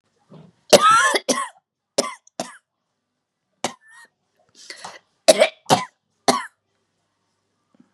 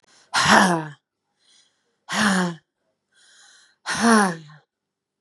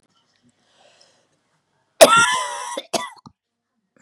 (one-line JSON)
{"three_cough_length": "7.9 s", "three_cough_amplitude": 32768, "three_cough_signal_mean_std_ratio": 0.29, "exhalation_length": "5.2 s", "exhalation_amplitude": 32767, "exhalation_signal_mean_std_ratio": 0.4, "cough_length": "4.0 s", "cough_amplitude": 32768, "cough_signal_mean_std_ratio": 0.28, "survey_phase": "beta (2021-08-13 to 2022-03-07)", "age": "45-64", "gender": "Female", "wearing_mask": "No", "symptom_cough_any": true, "symptom_runny_or_blocked_nose": true, "symptom_shortness_of_breath": true, "symptom_sore_throat": true, "symptom_diarrhoea": true, "symptom_fatigue": true, "symptom_headache": true, "symptom_other": true, "smoker_status": "Never smoked", "respiratory_condition_asthma": false, "respiratory_condition_other": true, "recruitment_source": "Test and Trace", "submission_delay": "1 day", "covid_test_result": "Positive", "covid_test_method": "LFT"}